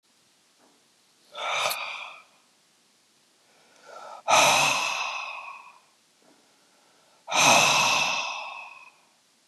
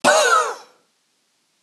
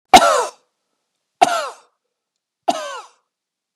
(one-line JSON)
{"exhalation_length": "9.5 s", "exhalation_amplitude": 17250, "exhalation_signal_mean_std_ratio": 0.43, "cough_length": "1.6 s", "cough_amplitude": 25684, "cough_signal_mean_std_ratio": 0.47, "three_cough_length": "3.8 s", "three_cough_amplitude": 32768, "three_cough_signal_mean_std_ratio": 0.29, "survey_phase": "beta (2021-08-13 to 2022-03-07)", "age": "45-64", "gender": "Male", "wearing_mask": "No", "symptom_runny_or_blocked_nose": true, "symptom_diarrhoea": true, "symptom_headache": true, "symptom_onset": "3 days", "smoker_status": "Never smoked", "respiratory_condition_asthma": false, "respiratory_condition_other": false, "recruitment_source": "Test and Trace", "submission_delay": "2 days", "covid_test_result": "Positive", "covid_test_method": "RT-qPCR", "covid_ct_value": 26.2, "covid_ct_gene": "ORF1ab gene", "covid_ct_mean": 26.7, "covid_viral_load": "1800 copies/ml", "covid_viral_load_category": "Minimal viral load (< 10K copies/ml)"}